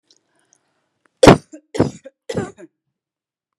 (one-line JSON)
{"three_cough_length": "3.6 s", "three_cough_amplitude": 32768, "three_cough_signal_mean_std_ratio": 0.21, "survey_phase": "beta (2021-08-13 to 2022-03-07)", "age": "18-44", "gender": "Female", "wearing_mask": "No", "symptom_none": true, "smoker_status": "Never smoked", "respiratory_condition_asthma": false, "respiratory_condition_other": false, "recruitment_source": "REACT", "submission_delay": "2 days", "covid_test_result": "Negative", "covid_test_method": "RT-qPCR", "influenza_a_test_result": "Negative", "influenza_b_test_result": "Negative"}